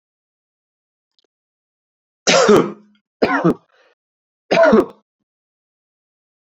three_cough_length: 6.5 s
three_cough_amplitude: 31285
three_cough_signal_mean_std_ratio: 0.33
survey_phase: beta (2021-08-13 to 2022-03-07)
age: 18-44
gender: Male
wearing_mask: 'No'
symptom_none: true
smoker_status: Never smoked
respiratory_condition_asthma: false
respiratory_condition_other: false
recruitment_source: REACT
submission_delay: 2 days
covid_test_result: Negative
covid_test_method: RT-qPCR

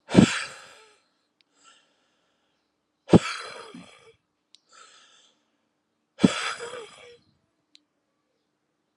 exhalation_length: 9.0 s
exhalation_amplitude: 32704
exhalation_signal_mean_std_ratio: 0.2
survey_phase: alpha (2021-03-01 to 2021-08-12)
age: 45-64
gender: Male
wearing_mask: 'No'
symptom_cough_any: true
symptom_fatigue: true
symptom_headache: true
symptom_onset: 7 days
smoker_status: Never smoked
respiratory_condition_asthma: false
respiratory_condition_other: false
recruitment_source: Test and Trace
submission_delay: 2 days
covid_test_result: Positive
covid_test_method: RT-qPCR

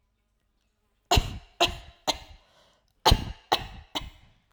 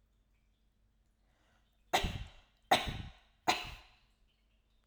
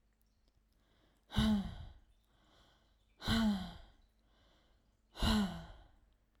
cough_length: 4.5 s
cough_amplitude: 18301
cough_signal_mean_std_ratio: 0.3
three_cough_length: 4.9 s
three_cough_amplitude: 6555
three_cough_signal_mean_std_ratio: 0.28
exhalation_length: 6.4 s
exhalation_amplitude: 3750
exhalation_signal_mean_std_ratio: 0.39
survey_phase: alpha (2021-03-01 to 2021-08-12)
age: 18-44
gender: Female
wearing_mask: 'No'
symptom_none: true
smoker_status: Never smoked
respiratory_condition_asthma: false
respiratory_condition_other: false
recruitment_source: REACT
submission_delay: 1 day
covid_test_result: Negative
covid_test_method: RT-qPCR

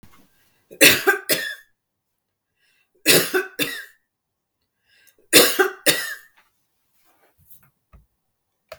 three_cough_length: 8.8 s
three_cough_amplitude: 32768
three_cough_signal_mean_std_ratio: 0.3
survey_phase: beta (2021-08-13 to 2022-03-07)
age: 45-64
gender: Female
wearing_mask: 'No'
symptom_none: true
smoker_status: Never smoked
respiratory_condition_asthma: false
respiratory_condition_other: false
recruitment_source: REACT
submission_delay: 1 day
covid_test_result: Negative
covid_test_method: RT-qPCR
influenza_a_test_result: Negative
influenza_b_test_result: Negative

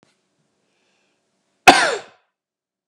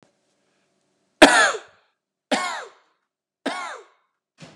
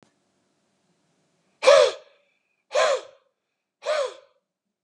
cough_length: 2.9 s
cough_amplitude: 32768
cough_signal_mean_std_ratio: 0.21
three_cough_length: 4.6 s
three_cough_amplitude: 32768
three_cough_signal_mean_std_ratio: 0.26
exhalation_length: 4.8 s
exhalation_amplitude: 29044
exhalation_signal_mean_std_ratio: 0.3
survey_phase: beta (2021-08-13 to 2022-03-07)
age: 45-64
gender: Male
wearing_mask: 'No'
symptom_none: true
symptom_onset: 5 days
smoker_status: Never smoked
respiratory_condition_asthma: false
respiratory_condition_other: false
recruitment_source: REACT
submission_delay: 1 day
covid_test_result: Negative
covid_test_method: RT-qPCR
influenza_a_test_result: Negative
influenza_b_test_result: Negative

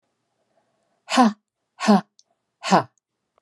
exhalation_length: 3.4 s
exhalation_amplitude: 24059
exhalation_signal_mean_std_ratio: 0.31
survey_phase: beta (2021-08-13 to 2022-03-07)
age: 65+
gender: Female
wearing_mask: 'No'
symptom_none: true
smoker_status: Never smoked
respiratory_condition_asthma: false
respiratory_condition_other: false
recruitment_source: Test and Trace
submission_delay: 2 days
covid_test_result: Positive
covid_test_method: RT-qPCR
covid_ct_value: 16.6
covid_ct_gene: N gene
covid_ct_mean: 17.1
covid_viral_load: 2400000 copies/ml
covid_viral_load_category: High viral load (>1M copies/ml)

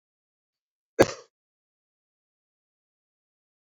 cough_length: 3.7 s
cough_amplitude: 22190
cough_signal_mean_std_ratio: 0.1
survey_phase: alpha (2021-03-01 to 2021-08-12)
age: 45-64
gender: Male
wearing_mask: 'No'
symptom_cough_any: true
symptom_new_continuous_cough: true
symptom_diarrhoea: true
symptom_fatigue: true
symptom_fever_high_temperature: true
symptom_headache: true
symptom_onset: 2 days
smoker_status: Ex-smoker
respiratory_condition_asthma: false
respiratory_condition_other: false
recruitment_source: Test and Trace
submission_delay: 2 days
covid_test_result: Positive
covid_test_method: RT-qPCR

